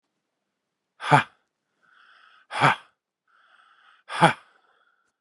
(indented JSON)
{
  "exhalation_length": "5.2 s",
  "exhalation_amplitude": 31047,
  "exhalation_signal_mean_std_ratio": 0.24,
  "survey_phase": "beta (2021-08-13 to 2022-03-07)",
  "age": "18-44",
  "gender": "Male",
  "wearing_mask": "No",
  "symptom_cough_any": true,
  "symptom_new_continuous_cough": true,
  "symptom_runny_or_blocked_nose": true,
  "symptom_headache": true,
  "symptom_change_to_sense_of_smell_or_taste": true,
  "symptom_loss_of_taste": true,
  "symptom_onset": "4 days",
  "smoker_status": "Never smoked",
  "respiratory_condition_asthma": false,
  "respiratory_condition_other": false,
  "recruitment_source": "Test and Trace",
  "submission_delay": "2 days",
  "covid_test_result": "Positive",
  "covid_test_method": "RT-qPCR",
  "covid_ct_value": 14.6,
  "covid_ct_gene": "ORF1ab gene",
  "covid_ct_mean": 15.6,
  "covid_viral_load": "7400000 copies/ml",
  "covid_viral_load_category": "High viral load (>1M copies/ml)"
}